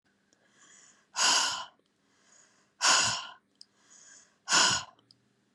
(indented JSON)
{
  "exhalation_length": "5.5 s",
  "exhalation_amplitude": 11655,
  "exhalation_signal_mean_std_ratio": 0.38,
  "survey_phase": "beta (2021-08-13 to 2022-03-07)",
  "age": "45-64",
  "gender": "Female",
  "wearing_mask": "Yes",
  "symptom_none": true,
  "smoker_status": "Current smoker (11 or more cigarettes per day)",
  "respiratory_condition_asthma": false,
  "respiratory_condition_other": false,
  "recruitment_source": "REACT",
  "submission_delay": "5 days",
  "covid_test_result": "Negative",
  "covid_test_method": "RT-qPCR"
}